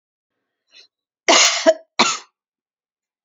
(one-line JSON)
{"cough_length": "3.2 s", "cough_amplitude": 32288, "cough_signal_mean_std_ratio": 0.32, "survey_phase": "beta (2021-08-13 to 2022-03-07)", "age": "45-64", "gender": "Female", "wearing_mask": "No", "symptom_cough_any": true, "symptom_runny_or_blocked_nose": true, "symptom_shortness_of_breath": true, "symptom_sore_throat": true, "symptom_headache": true, "smoker_status": "Never smoked", "respiratory_condition_asthma": false, "respiratory_condition_other": false, "recruitment_source": "Test and Trace", "submission_delay": "2 days", "covid_test_result": "Positive", "covid_test_method": "LAMP"}